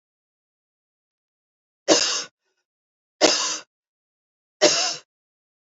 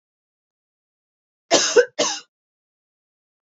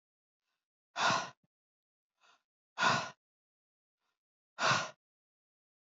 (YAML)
three_cough_length: 5.6 s
three_cough_amplitude: 31387
three_cough_signal_mean_std_ratio: 0.31
cough_length: 3.4 s
cough_amplitude: 26465
cough_signal_mean_std_ratio: 0.27
exhalation_length: 6.0 s
exhalation_amplitude: 5443
exhalation_signal_mean_std_ratio: 0.29
survey_phase: beta (2021-08-13 to 2022-03-07)
age: 18-44
gender: Female
wearing_mask: 'No'
symptom_cough_any: true
symptom_fever_high_temperature: true
smoker_status: Never smoked
respiratory_condition_asthma: false
respiratory_condition_other: false
recruitment_source: Test and Trace
submission_delay: 1 day
covid_test_result: Positive
covid_test_method: LFT